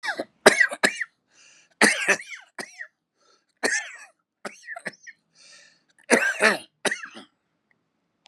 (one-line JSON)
{"cough_length": "8.3 s", "cough_amplitude": 32768, "cough_signal_mean_std_ratio": 0.33, "survey_phase": "beta (2021-08-13 to 2022-03-07)", "age": "65+", "gender": "Male", "wearing_mask": "No", "symptom_cough_any": true, "symptom_onset": "5 days", "smoker_status": "Never smoked", "respiratory_condition_asthma": false, "respiratory_condition_other": false, "recruitment_source": "Test and Trace", "submission_delay": "2 days", "covid_test_result": "Positive", "covid_test_method": "ePCR"}